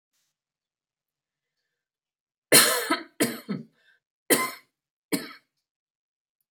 {"cough_length": "6.5 s", "cough_amplitude": 26398, "cough_signal_mean_std_ratio": 0.27, "survey_phase": "alpha (2021-03-01 to 2021-08-12)", "age": "65+", "gender": "Female", "wearing_mask": "No", "symptom_none": true, "smoker_status": "Ex-smoker", "respiratory_condition_asthma": false, "respiratory_condition_other": false, "recruitment_source": "REACT", "submission_delay": "1 day", "covid_test_result": "Negative", "covid_test_method": "RT-qPCR"}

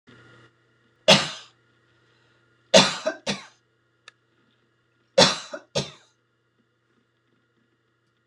{"three_cough_length": "8.3 s", "three_cough_amplitude": 26028, "three_cough_signal_mean_std_ratio": 0.23, "survey_phase": "beta (2021-08-13 to 2022-03-07)", "age": "65+", "gender": "Female", "wearing_mask": "No", "symptom_none": true, "smoker_status": "Never smoked", "respiratory_condition_asthma": false, "respiratory_condition_other": false, "recruitment_source": "REACT", "submission_delay": "3 days", "covid_test_result": "Negative", "covid_test_method": "RT-qPCR"}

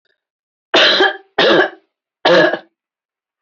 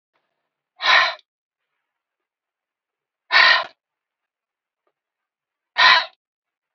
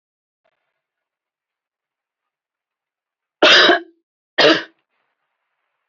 {"three_cough_length": "3.4 s", "three_cough_amplitude": 31895, "three_cough_signal_mean_std_ratio": 0.47, "exhalation_length": "6.7 s", "exhalation_amplitude": 29853, "exhalation_signal_mean_std_ratio": 0.28, "cough_length": "5.9 s", "cough_amplitude": 28682, "cough_signal_mean_std_ratio": 0.25, "survey_phase": "beta (2021-08-13 to 2022-03-07)", "age": "45-64", "gender": "Female", "wearing_mask": "No", "symptom_none": true, "smoker_status": "Ex-smoker", "respiratory_condition_asthma": false, "respiratory_condition_other": false, "recruitment_source": "REACT", "submission_delay": "1 day", "covid_test_result": "Negative", "covid_test_method": "RT-qPCR", "influenza_a_test_result": "Negative", "influenza_b_test_result": "Negative"}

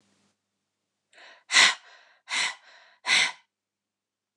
{"exhalation_length": "4.4 s", "exhalation_amplitude": 21761, "exhalation_signal_mean_std_ratio": 0.3, "survey_phase": "beta (2021-08-13 to 2022-03-07)", "age": "65+", "gender": "Female", "wearing_mask": "No", "symptom_none": true, "smoker_status": "Never smoked", "respiratory_condition_asthma": false, "respiratory_condition_other": false, "recruitment_source": "REACT", "submission_delay": "1 day", "covid_test_result": "Negative", "covid_test_method": "RT-qPCR"}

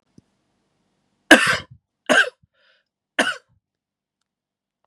{"three_cough_length": "4.9 s", "three_cough_amplitude": 32768, "three_cough_signal_mean_std_ratio": 0.24, "survey_phase": "beta (2021-08-13 to 2022-03-07)", "age": "18-44", "gender": "Male", "wearing_mask": "No", "symptom_none": true, "smoker_status": "Never smoked", "respiratory_condition_asthma": false, "respiratory_condition_other": false, "recruitment_source": "REACT", "submission_delay": "2 days", "covid_test_result": "Negative", "covid_test_method": "RT-qPCR", "influenza_a_test_result": "Negative", "influenza_b_test_result": "Negative"}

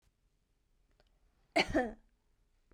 {"cough_length": "2.7 s", "cough_amplitude": 4598, "cough_signal_mean_std_ratio": 0.26, "survey_phase": "beta (2021-08-13 to 2022-03-07)", "age": "18-44", "gender": "Female", "wearing_mask": "No", "symptom_diarrhoea": true, "symptom_fatigue": true, "symptom_headache": true, "symptom_onset": "3 days", "smoker_status": "Never smoked", "respiratory_condition_asthma": false, "respiratory_condition_other": false, "recruitment_source": "Test and Trace", "submission_delay": "1 day", "covid_test_result": "Positive", "covid_test_method": "RT-qPCR", "covid_ct_value": 17.4, "covid_ct_gene": "ORF1ab gene"}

